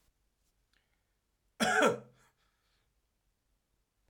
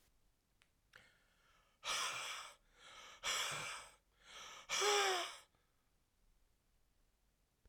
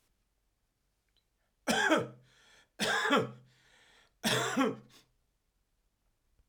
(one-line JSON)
{"cough_length": "4.1 s", "cough_amplitude": 6071, "cough_signal_mean_std_ratio": 0.24, "exhalation_length": "7.7 s", "exhalation_amplitude": 2221, "exhalation_signal_mean_std_ratio": 0.41, "three_cough_length": "6.5 s", "three_cough_amplitude": 6612, "three_cough_signal_mean_std_ratio": 0.38, "survey_phase": "beta (2021-08-13 to 2022-03-07)", "age": "45-64", "gender": "Male", "wearing_mask": "No", "symptom_cough_any": true, "symptom_runny_or_blocked_nose": true, "symptom_sore_throat": true, "symptom_headache": true, "symptom_other": true, "smoker_status": "Ex-smoker", "respiratory_condition_asthma": false, "respiratory_condition_other": false, "recruitment_source": "Test and Trace", "submission_delay": "2 days", "covid_test_result": "Positive", "covid_test_method": "RT-qPCR", "covid_ct_value": 29.0, "covid_ct_gene": "ORF1ab gene", "covid_ct_mean": 29.9, "covid_viral_load": "150 copies/ml", "covid_viral_load_category": "Minimal viral load (< 10K copies/ml)"}